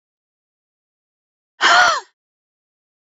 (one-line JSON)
{"exhalation_length": "3.1 s", "exhalation_amplitude": 30408, "exhalation_signal_mean_std_ratio": 0.28, "survey_phase": "beta (2021-08-13 to 2022-03-07)", "age": "65+", "gender": "Female", "wearing_mask": "No", "symptom_none": true, "smoker_status": "Never smoked", "respiratory_condition_asthma": false, "respiratory_condition_other": true, "recruitment_source": "REACT", "submission_delay": "34 days", "covid_test_result": "Negative", "covid_test_method": "RT-qPCR", "influenza_a_test_result": "Unknown/Void", "influenza_b_test_result": "Unknown/Void"}